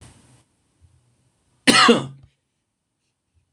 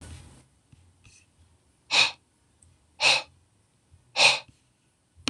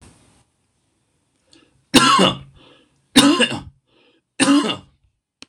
{"cough_length": "3.5 s", "cough_amplitude": 26028, "cough_signal_mean_std_ratio": 0.25, "exhalation_length": "5.3 s", "exhalation_amplitude": 19339, "exhalation_signal_mean_std_ratio": 0.28, "three_cough_length": "5.5 s", "three_cough_amplitude": 26028, "three_cough_signal_mean_std_ratio": 0.37, "survey_phase": "beta (2021-08-13 to 2022-03-07)", "age": "45-64", "gender": "Male", "wearing_mask": "No", "symptom_none": true, "smoker_status": "Never smoked", "respiratory_condition_asthma": false, "respiratory_condition_other": false, "recruitment_source": "REACT", "submission_delay": "3 days", "covid_test_result": "Negative", "covid_test_method": "RT-qPCR", "influenza_a_test_result": "Unknown/Void", "influenza_b_test_result": "Unknown/Void"}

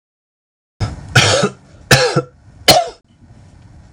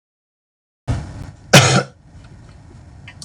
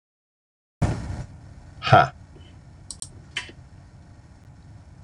{"three_cough_length": "3.9 s", "three_cough_amplitude": 31186, "three_cough_signal_mean_std_ratio": 0.41, "cough_length": "3.2 s", "cough_amplitude": 28214, "cough_signal_mean_std_ratio": 0.32, "exhalation_length": "5.0 s", "exhalation_amplitude": 26034, "exhalation_signal_mean_std_ratio": 0.29, "survey_phase": "alpha (2021-03-01 to 2021-08-12)", "age": "45-64", "gender": "Male", "wearing_mask": "No", "symptom_none": true, "smoker_status": "Never smoked", "respiratory_condition_asthma": false, "respiratory_condition_other": false, "recruitment_source": "REACT", "submission_delay": "1 day", "covid_test_result": "Negative", "covid_test_method": "RT-qPCR"}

